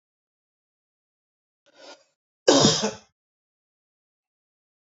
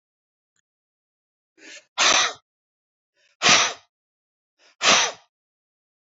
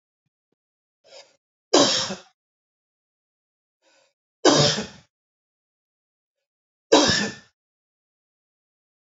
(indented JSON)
{
  "cough_length": "4.9 s",
  "cough_amplitude": 30784,
  "cough_signal_mean_std_ratio": 0.22,
  "exhalation_length": "6.1 s",
  "exhalation_amplitude": 26113,
  "exhalation_signal_mean_std_ratio": 0.3,
  "three_cough_length": "9.1 s",
  "three_cough_amplitude": 27907,
  "three_cough_signal_mean_std_ratio": 0.26,
  "survey_phase": "beta (2021-08-13 to 2022-03-07)",
  "age": "18-44",
  "gender": "Male",
  "wearing_mask": "No",
  "symptom_headache": true,
  "smoker_status": "Never smoked",
  "respiratory_condition_asthma": true,
  "respiratory_condition_other": false,
  "recruitment_source": "REACT",
  "submission_delay": "1 day",
  "covid_test_result": "Negative",
  "covid_test_method": "RT-qPCR",
  "influenza_a_test_result": "Negative",
  "influenza_b_test_result": "Negative"
}